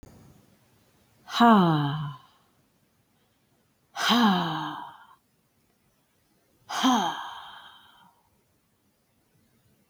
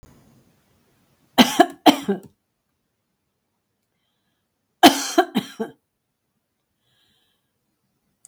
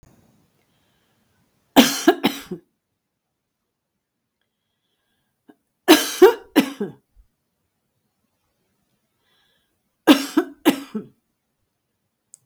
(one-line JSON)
{"exhalation_length": "9.9 s", "exhalation_amplitude": 14200, "exhalation_signal_mean_std_ratio": 0.35, "cough_length": "8.3 s", "cough_amplitude": 32768, "cough_signal_mean_std_ratio": 0.21, "three_cough_length": "12.5 s", "three_cough_amplitude": 32768, "three_cough_signal_mean_std_ratio": 0.23, "survey_phase": "beta (2021-08-13 to 2022-03-07)", "age": "65+", "gender": "Female", "wearing_mask": "No", "symptom_none": true, "smoker_status": "Never smoked", "respiratory_condition_asthma": false, "respiratory_condition_other": false, "recruitment_source": "REACT", "submission_delay": "1 day", "covid_test_result": "Negative", "covid_test_method": "RT-qPCR", "influenza_a_test_result": "Negative", "influenza_b_test_result": "Negative"}